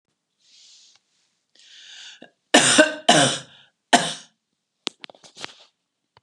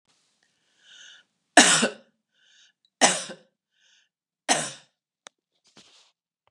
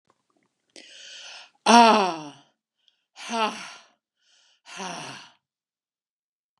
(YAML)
cough_length: 6.2 s
cough_amplitude: 32767
cough_signal_mean_std_ratio: 0.29
three_cough_length: 6.5 s
three_cough_amplitude: 32668
three_cough_signal_mean_std_ratio: 0.23
exhalation_length: 6.6 s
exhalation_amplitude: 29718
exhalation_signal_mean_std_ratio: 0.26
survey_phase: beta (2021-08-13 to 2022-03-07)
age: 65+
gender: Female
wearing_mask: 'No'
symptom_none: true
smoker_status: Never smoked
respiratory_condition_asthma: false
respiratory_condition_other: false
recruitment_source: REACT
submission_delay: 1 day
covid_test_result: Negative
covid_test_method: RT-qPCR
influenza_a_test_result: Negative
influenza_b_test_result: Negative